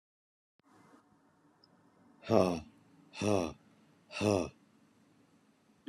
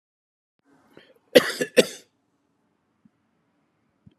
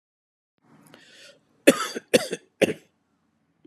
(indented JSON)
{
  "exhalation_length": "5.9 s",
  "exhalation_amplitude": 9672,
  "exhalation_signal_mean_std_ratio": 0.29,
  "cough_length": "4.2 s",
  "cough_amplitude": 32036,
  "cough_signal_mean_std_ratio": 0.17,
  "three_cough_length": "3.7 s",
  "three_cough_amplitude": 32629,
  "three_cough_signal_mean_std_ratio": 0.23,
  "survey_phase": "beta (2021-08-13 to 2022-03-07)",
  "age": "45-64",
  "gender": "Male",
  "wearing_mask": "No",
  "symptom_none": true,
  "symptom_onset": "12 days",
  "smoker_status": "Never smoked",
  "respiratory_condition_asthma": false,
  "respiratory_condition_other": false,
  "recruitment_source": "REACT",
  "submission_delay": "1 day",
  "covid_test_result": "Negative",
  "covid_test_method": "RT-qPCR"
}